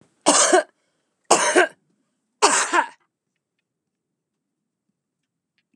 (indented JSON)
{
  "three_cough_length": "5.8 s",
  "three_cough_amplitude": 31662,
  "three_cough_signal_mean_std_ratio": 0.34,
  "survey_phase": "beta (2021-08-13 to 2022-03-07)",
  "age": "45-64",
  "gender": "Female",
  "wearing_mask": "No",
  "symptom_none": true,
  "smoker_status": "Current smoker (1 to 10 cigarettes per day)",
  "respiratory_condition_asthma": false,
  "respiratory_condition_other": false,
  "recruitment_source": "REACT",
  "submission_delay": "5 days",
  "covid_test_result": "Negative",
  "covid_test_method": "RT-qPCR",
  "influenza_a_test_result": "Negative",
  "influenza_b_test_result": "Negative"
}